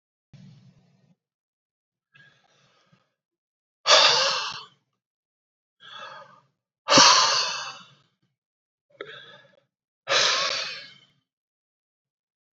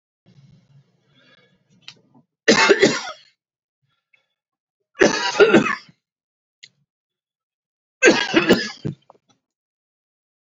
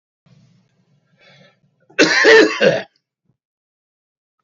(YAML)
exhalation_length: 12.5 s
exhalation_amplitude: 25143
exhalation_signal_mean_std_ratio: 0.3
three_cough_length: 10.4 s
three_cough_amplitude: 32768
three_cough_signal_mean_std_ratio: 0.31
cough_length: 4.4 s
cough_amplitude: 30875
cough_signal_mean_std_ratio: 0.33
survey_phase: beta (2021-08-13 to 2022-03-07)
age: 65+
gender: Male
wearing_mask: 'No'
symptom_none: true
symptom_onset: 12 days
smoker_status: Ex-smoker
respiratory_condition_asthma: false
respiratory_condition_other: false
recruitment_source: REACT
submission_delay: 2 days
covid_test_result: Negative
covid_test_method: RT-qPCR
influenza_a_test_result: Negative
influenza_b_test_result: Negative